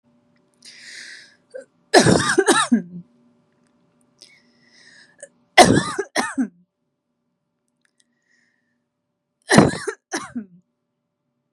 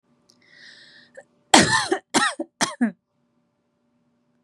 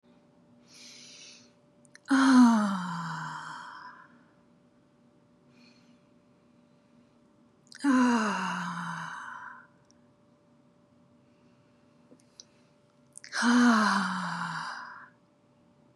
{"three_cough_length": "11.5 s", "three_cough_amplitude": 32768, "three_cough_signal_mean_std_ratio": 0.29, "cough_length": "4.4 s", "cough_amplitude": 32768, "cough_signal_mean_std_ratio": 0.31, "exhalation_length": "16.0 s", "exhalation_amplitude": 10321, "exhalation_signal_mean_std_ratio": 0.39, "survey_phase": "beta (2021-08-13 to 2022-03-07)", "age": "18-44", "gender": "Female", "wearing_mask": "No", "symptom_none": true, "smoker_status": "Never smoked", "respiratory_condition_asthma": false, "respiratory_condition_other": false, "recruitment_source": "Test and Trace", "submission_delay": "2 days", "covid_test_result": "Positive", "covid_test_method": "RT-qPCR", "covid_ct_value": 32.5, "covid_ct_gene": "S gene", "covid_ct_mean": 33.3, "covid_viral_load": "12 copies/ml", "covid_viral_load_category": "Minimal viral load (< 10K copies/ml)"}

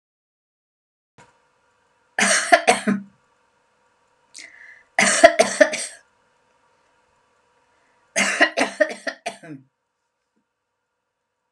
{"three_cough_length": "11.5 s", "three_cough_amplitude": 32768, "three_cough_signal_mean_std_ratio": 0.29, "survey_phase": "beta (2021-08-13 to 2022-03-07)", "age": "45-64", "gender": "Female", "wearing_mask": "No", "symptom_none": true, "smoker_status": "Never smoked", "respiratory_condition_asthma": false, "respiratory_condition_other": false, "recruitment_source": "REACT", "submission_delay": "1 day", "covid_test_result": "Negative", "covid_test_method": "RT-qPCR"}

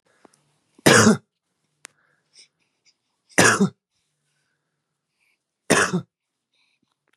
{"three_cough_length": "7.2 s", "three_cough_amplitude": 31743, "three_cough_signal_mean_std_ratio": 0.27, "survey_phase": "beta (2021-08-13 to 2022-03-07)", "age": "18-44", "gender": "Male", "wearing_mask": "No", "symptom_none": true, "smoker_status": "Never smoked", "respiratory_condition_asthma": false, "respiratory_condition_other": false, "recruitment_source": "REACT", "submission_delay": "1 day", "covid_test_result": "Negative", "covid_test_method": "RT-qPCR", "influenza_a_test_result": "Negative", "influenza_b_test_result": "Negative"}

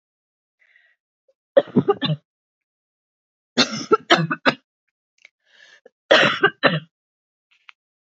{"three_cough_length": "8.2 s", "three_cough_amplitude": 29652, "three_cough_signal_mean_std_ratio": 0.3, "survey_phase": "beta (2021-08-13 to 2022-03-07)", "age": "45-64", "gender": "Female", "wearing_mask": "No", "symptom_cough_any": true, "symptom_runny_or_blocked_nose": true, "symptom_fatigue": true, "smoker_status": "Never smoked", "respiratory_condition_asthma": false, "respiratory_condition_other": false, "recruitment_source": "Test and Trace", "submission_delay": "3 days", "covid_test_result": "Positive", "covid_test_method": "LFT"}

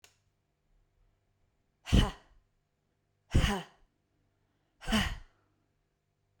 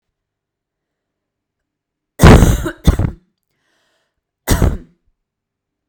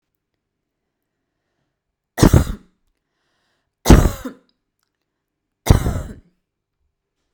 {"exhalation_length": "6.4 s", "exhalation_amplitude": 8284, "exhalation_signal_mean_std_ratio": 0.26, "cough_length": "5.9 s", "cough_amplitude": 32768, "cough_signal_mean_std_ratio": 0.29, "three_cough_length": "7.3 s", "three_cough_amplitude": 32768, "three_cough_signal_mean_std_ratio": 0.23, "survey_phase": "beta (2021-08-13 to 2022-03-07)", "age": "18-44", "gender": "Female", "wearing_mask": "No", "symptom_cough_any": true, "symptom_runny_or_blocked_nose": true, "symptom_sore_throat": true, "symptom_fatigue": true, "symptom_headache": true, "symptom_other": true, "smoker_status": "Never smoked", "respiratory_condition_asthma": false, "respiratory_condition_other": false, "recruitment_source": "Test and Trace", "submission_delay": "1 day", "covid_test_result": "Negative", "covid_test_method": "RT-qPCR"}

